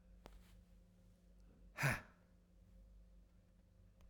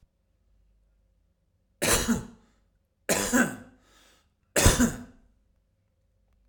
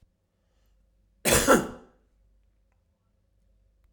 {"exhalation_length": "4.1 s", "exhalation_amplitude": 1929, "exhalation_signal_mean_std_ratio": 0.33, "three_cough_length": "6.5 s", "three_cough_amplitude": 19751, "three_cough_signal_mean_std_ratio": 0.33, "cough_length": "3.9 s", "cough_amplitude": 20819, "cough_signal_mean_std_ratio": 0.25, "survey_phase": "alpha (2021-03-01 to 2021-08-12)", "age": "45-64", "gender": "Male", "wearing_mask": "No", "symptom_cough_any": true, "smoker_status": "Ex-smoker", "respiratory_condition_asthma": false, "respiratory_condition_other": false, "recruitment_source": "REACT", "submission_delay": "2 days", "covid_test_method": "RT-qPCR"}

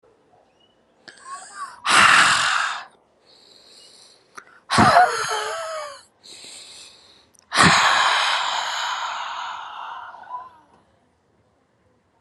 {"exhalation_length": "12.2 s", "exhalation_amplitude": 30573, "exhalation_signal_mean_std_ratio": 0.46, "survey_phase": "alpha (2021-03-01 to 2021-08-12)", "age": "18-44", "gender": "Female", "wearing_mask": "No", "symptom_none": true, "smoker_status": "Never smoked", "respiratory_condition_asthma": true, "respiratory_condition_other": false, "recruitment_source": "REACT", "submission_delay": "3 days", "covid_test_result": "Negative", "covid_test_method": "RT-qPCR"}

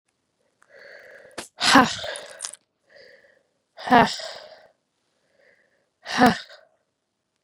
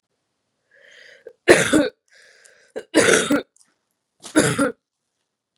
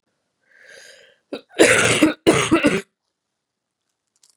{"exhalation_length": "7.4 s", "exhalation_amplitude": 32767, "exhalation_signal_mean_std_ratio": 0.26, "three_cough_length": "5.6 s", "three_cough_amplitude": 32768, "three_cough_signal_mean_std_ratio": 0.35, "cough_length": "4.4 s", "cough_amplitude": 32722, "cough_signal_mean_std_ratio": 0.38, "survey_phase": "beta (2021-08-13 to 2022-03-07)", "age": "18-44", "gender": "Female", "wearing_mask": "No", "symptom_cough_any": true, "symptom_runny_or_blocked_nose": true, "symptom_fatigue": true, "symptom_headache": true, "symptom_other": true, "symptom_onset": "2 days", "smoker_status": "Never smoked", "respiratory_condition_asthma": false, "respiratory_condition_other": false, "recruitment_source": "Test and Trace", "submission_delay": "1 day", "covid_test_result": "Positive", "covid_test_method": "RT-qPCR", "covid_ct_value": 18.3, "covid_ct_gene": "ORF1ab gene", "covid_ct_mean": 18.8, "covid_viral_load": "680000 copies/ml", "covid_viral_load_category": "Low viral load (10K-1M copies/ml)"}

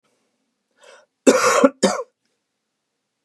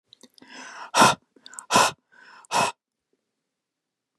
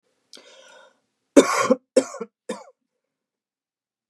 {"cough_length": "3.2 s", "cough_amplitude": 32310, "cough_signal_mean_std_ratio": 0.32, "exhalation_length": "4.2 s", "exhalation_amplitude": 25914, "exhalation_signal_mean_std_ratio": 0.3, "three_cough_length": "4.1 s", "three_cough_amplitude": 32768, "three_cough_signal_mean_std_ratio": 0.24, "survey_phase": "beta (2021-08-13 to 2022-03-07)", "age": "18-44", "gender": "Male", "wearing_mask": "No", "symptom_none": true, "smoker_status": "Never smoked", "respiratory_condition_asthma": false, "respiratory_condition_other": false, "recruitment_source": "REACT", "submission_delay": "1 day", "covid_test_result": "Negative", "covid_test_method": "RT-qPCR", "influenza_a_test_result": "Negative", "influenza_b_test_result": "Negative"}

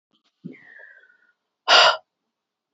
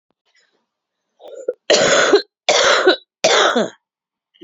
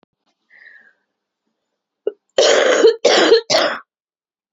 {"exhalation_length": "2.7 s", "exhalation_amplitude": 25739, "exhalation_signal_mean_std_ratio": 0.27, "three_cough_length": "4.4 s", "three_cough_amplitude": 32767, "three_cough_signal_mean_std_ratio": 0.49, "cough_length": "4.5 s", "cough_amplitude": 28822, "cough_signal_mean_std_ratio": 0.44, "survey_phase": "beta (2021-08-13 to 2022-03-07)", "age": "18-44", "gender": "Female", "wearing_mask": "No", "symptom_cough_any": true, "symptom_shortness_of_breath": true, "symptom_sore_throat": true, "symptom_fatigue": true, "symptom_headache": true, "symptom_onset": "6 days", "smoker_status": "Current smoker (e-cigarettes or vapes only)", "respiratory_condition_asthma": true, "respiratory_condition_other": false, "recruitment_source": "Test and Trace", "submission_delay": "1 day", "covid_test_result": "Positive", "covid_test_method": "RT-qPCR", "covid_ct_value": 27.9, "covid_ct_gene": "N gene"}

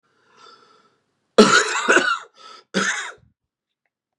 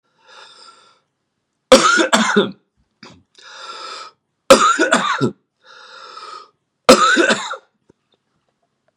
{"cough_length": "4.2 s", "cough_amplitude": 32767, "cough_signal_mean_std_ratio": 0.37, "three_cough_length": "9.0 s", "three_cough_amplitude": 32768, "three_cough_signal_mean_std_ratio": 0.38, "survey_phase": "beta (2021-08-13 to 2022-03-07)", "age": "45-64", "gender": "Male", "wearing_mask": "No", "symptom_cough_any": true, "symptom_runny_or_blocked_nose": true, "symptom_headache": true, "symptom_onset": "3 days", "smoker_status": "Ex-smoker", "respiratory_condition_asthma": false, "respiratory_condition_other": false, "recruitment_source": "Test and Trace", "submission_delay": "2 days", "covid_test_result": "Positive", "covid_test_method": "RT-qPCR"}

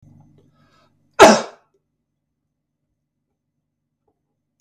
{"cough_length": "4.6 s", "cough_amplitude": 32768, "cough_signal_mean_std_ratio": 0.17, "survey_phase": "beta (2021-08-13 to 2022-03-07)", "age": "45-64", "gender": "Male", "wearing_mask": "No", "symptom_none": true, "symptom_onset": "11 days", "smoker_status": "Never smoked", "respiratory_condition_asthma": true, "respiratory_condition_other": false, "recruitment_source": "REACT", "submission_delay": "1 day", "covid_test_result": "Negative", "covid_test_method": "RT-qPCR"}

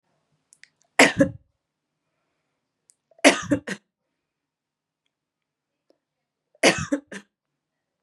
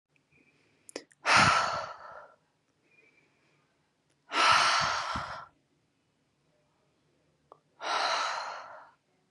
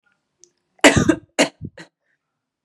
{"three_cough_length": "8.0 s", "three_cough_amplitude": 31357, "three_cough_signal_mean_std_ratio": 0.22, "exhalation_length": "9.3 s", "exhalation_amplitude": 11985, "exhalation_signal_mean_std_ratio": 0.39, "cough_length": "2.6 s", "cough_amplitude": 32767, "cough_signal_mean_std_ratio": 0.28, "survey_phase": "beta (2021-08-13 to 2022-03-07)", "age": "18-44", "gender": "Female", "wearing_mask": "No", "symptom_cough_any": true, "symptom_runny_or_blocked_nose": true, "symptom_shortness_of_breath": true, "symptom_sore_throat": true, "symptom_fatigue": true, "symptom_fever_high_temperature": true, "symptom_headache": true, "symptom_onset": "4 days", "smoker_status": "Never smoked", "recruitment_source": "Test and Trace", "submission_delay": "2 days", "covid_test_result": "Positive", "covid_test_method": "RT-qPCR", "covid_ct_value": 17.2, "covid_ct_gene": "ORF1ab gene", "covid_ct_mean": 17.2, "covid_viral_load": "2200000 copies/ml", "covid_viral_load_category": "High viral load (>1M copies/ml)"}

